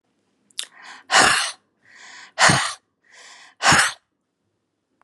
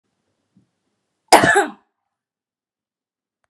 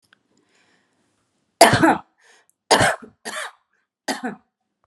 {"exhalation_length": "5.0 s", "exhalation_amplitude": 30766, "exhalation_signal_mean_std_ratio": 0.36, "cough_length": "3.5 s", "cough_amplitude": 32768, "cough_signal_mean_std_ratio": 0.23, "three_cough_length": "4.9 s", "three_cough_amplitude": 32768, "three_cough_signal_mean_std_ratio": 0.3, "survey_phase": "beta (2021-08-13 to 2022-03-07)", "age": "18-44", "gender": "Female", "wearing_mask": "No", "symptom_none": true, "symptom_onset": "3 days", "smoker_status": "Ex-smoker", "respiratory_condition_asthma": false, "respiratory_condition_other": false, "recruitment_source": "REACT", "submission_delay": "1 day", "covid_test_result": "Negative", "covid_test_method": "RT-qPCR"}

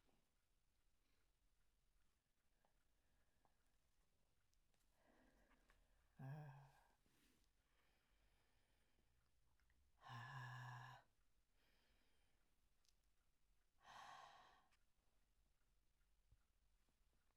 {"exhalation_length": "17.4 s", "exhalation_amplitude": 171, "exhalation_signal_mean_std_ratio": 0.44, "survey_phase": "alpha (2021-03-01 to 2021-08-12)", "age": "65+", "gender": "Female", "wearing_mask": "No", "symptom_none": true, "smoker_status": "Never smoked", "respiratory_condition_asthma": false, "respiratory_condition_other": false, "recruitment_source": "REACT", "submission_delay": "1 day", "covid_test_result": "Negative", "covid_test_method": "RT-qPCR"}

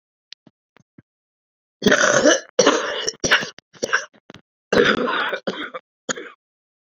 {"three_cough_length": "7.0 s", "three_cough_amplitude": 29082, "three_cough_signal_mean_std_ratio": 0.43, "survey_phase": "beta (2021-08-13 to 2022-03-07)", "age": "18-44", "gender": "Female", "wearing_mask": "No", "symptom_cough_any": true, "symptom_runny_or_blocked_nose": true, "symptom_shortness_of_breath": true, "symptom_fatigue": true, "symptom_fever_high_temperature": true, "symptom_headache": true, "symptom_change_to_sense_of_smell_or_taste": true, "symptom_loss_of_taste": true, "symptom_other": true, "symptom_onset": "3 days", "smoker_status": "Never smoked", "respiratory_condition_asthma": true, "respiratory_condition_other": false, "recruitment_source": "Test and Trace", "submission_delay": "2 days", "covid_test_result": "Positive", "covid_test_method": "RT-qPCR", "covid_ct_value": 11.1, "covid_ct_gene": "ORF1ab gene", "covid_ct_mean": 11.7, "covid_viral_load": "150000000 copies/ml", "covid_viral_load_category": "High viral load (>1M copies/ml)"}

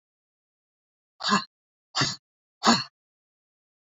{"exhalation_length": "3.9 s", "exhalation_amplitude": 15557, "exhalation_signal_mean_std_ratio": 0.28, "survey_phase": "beta (2021-08-13 to 2022-03-07)", "age": "45-64", "gender": "Female", "wearing_mask": "No", "symptom_cough_any": true, "symptom_runny_or_blocked_nose": true, "symptom_onset": "6 days", "smoker_status": "Never smoked", "respiratory_condition_asthma": false, "respiratory_condition_other": false, "recruitment_source": "Test and Trace", "submission_delay": "1 day", "covid_test_result": "Positive", "covid_test_method": "RT-qPCR", "covid_ct_value": 15.9, "covid_ct_gene": "ORF1ab gene", "covid_ct_mean": 16.3, "covid_viral_load": "4700000 copies/ml", "covid_viral_load_category": "High viral load (>1M copies/ml)"}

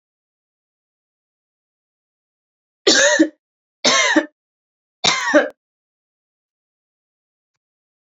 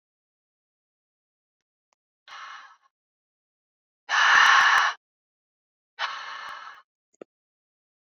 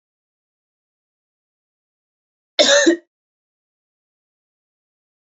{"three_cough_length": "8.0 s", "three_cough_amplitude": 32625, "three_cough_signal_mean_std_ratio": 0.3, "exhalation_length": "8.1 s", "exhalation_amplitude": 19276, "exhalation_signal_mean_std_ratio": 0.29, "cough_length": "5.3 s", "cough_amplitude": 29781, "cough_signal_mean_std_ratio": 0.21, "survey_phase": "beta (2021-08-13 to 2022-03-07)", "age": "18-44", "gender": "Female", "wearing_mask": "No", "symptom_change_to_sense_of_smell_or_taste": true, "symptom_loss_of_taste": true, "symptom_onset": "5 days", "smoker_status": "Never smoked", "respiratory_condition_asthma": false, "respiratory_condition_other": false, "recruitment_source": "Test and Trace", "submission_delay": "2 days", "covid_test_result": "Positive", "covid_test_method": "RT-qPCR", "covid_ct_value": 17.5, "covid_ct_gene": "ORF1ab gene", "covid_ct_mean": 17.7, "covid_viral_load": "1500000 copies/ml", "covid_viral_load_category": "High viral load (>1M copies/ml)"}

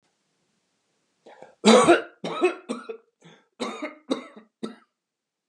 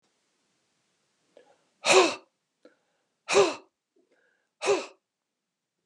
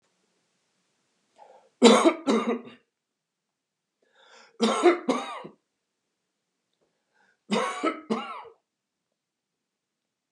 {"cough_length": "5.5 s", "cough_amplitude": 27225, "cough_signal_mean_std_ratio": 0.3, "exhalation_length": "5.9 s", "exhalation_amplitude": 19893, "exhalation_signal_mean_std_ratio": 0.26, "three_cough_length": "10.3 s", "three_cough_amplitude": 26241, "three_cough_signal_mean_std_ratio": 0.3, "survey_phase": "beta (2021-08-13 to 2022-03-07)", "age": "45-64", "gender": "Male", "wearing_mask": "No", "symptom_none": true, "smoker_status": "Never smoked", "respiratory_condition_asthma": false, "respiratory_condition_other": false, "recruitment_source": "REACT", "submission_delay": "15 days", "covid_test_result": "Negative", "covid_test_method": "RT-qPCR"}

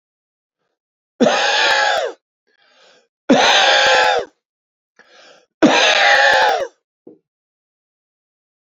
{"three_cough_length": "8.7 s", "three_cough_amplitude": 28650, "three_cough_signal_mean_std_ratio": 0.5, "survey_phase": "beta (2021-08-13 to 2022-03-07)", "age": "65+", "gender": "Male", "wearing_mask": "No", "symptom_cough_any": true, "symptom_runny_or_blocked_nose": true, "symptom_sore_throat": true, "symptom_headache": true, "symptom_other": true, "symptom_onset": "4 days", "smoker_status": "Ex-smoker", "respiratory_condition_asthma": false, "respiratory_condition_other": true, "recruitment_source": "Test and Trace", "submission_delay": "1 day", "covid_test_result": "Positive", "covid_test_method": "RT-qPCR", "covid_ct_value": 17.8, "covid_ct_gene": "ORF1ab gene", "covid_ct_mean": 18.3, "covid_viral_load": "990000 copies/ml", "covid_viral_load_category": "Low viral load (10K-1M copies/ml)"}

